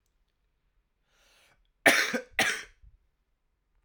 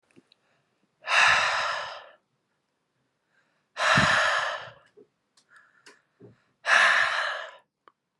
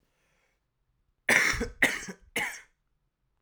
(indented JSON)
{
  "cough_length": "3.8 s",
  "cough_amplitude": 17863,
  "cough_signal_mean_std_ratio": 0.27,
  "exhalation_length": "8.2 s",
  "exhalation_amplitude": 15753,
  "exhalation_signal_mean_std_ratio": 0.44,
  "three_cough_length": "3.4 s",
  "three_cough_amplitude": 17948,
  "three_cough_signal_mean_std_ratio": 0.35,
  "survey_phase": "alpha (2021-03-01 to 2021-08-12)",
  "age": "18-44",
  "gender": "Male",
  "wearing_mask": "No",
  "symptom_abdominal_pain": true,
  "symptom_headache": true,
  "smoker_status": "Never smoked",
  "respiratory_condition_asthma": false,
  "respiratory_condition_other": false,
  "recruitment_source": "Test and Trace",
  "submission_delay": "2 days",
  "covid_test_result": "Positive",
  "covid_test_method": "RT-qPCR",
  "covid_ct_value": 25.5,
  "covid_ct_gene": "N gene"
}